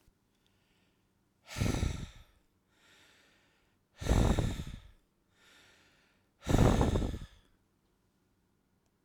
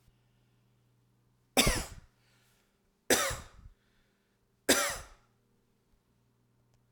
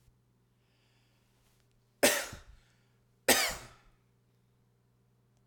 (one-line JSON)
{"exhalation_length": "9.0 s", "exhalation_amplitude": 8062, "exhalation_signal_mean_std_ratio": 0.35, "three_cough_length": "6.9 s", "three_cough_amplitude": 11736, "three_cough_signal_mean_std_ratio": 0.27, "cough_length": "5.5 s", "cough_amplitude": 13649, "cough_signal_mean_std_ratio": 0.24, "survey_phase": "alpha (2021-03-01 to 2021-08-12)", "age": "45-64", "gender": "Male", "wearing_mask": "No", "symptom_none": true, "smoker_status": "Ex-smoker", "respiratory_condition_asthma": false, "respiratory_condition_other": false, "recruitment_source": "REACT", "submission_delay": "2 days", "covid_test_result": "Negative", "covid_test_method": "RT-qPCR"}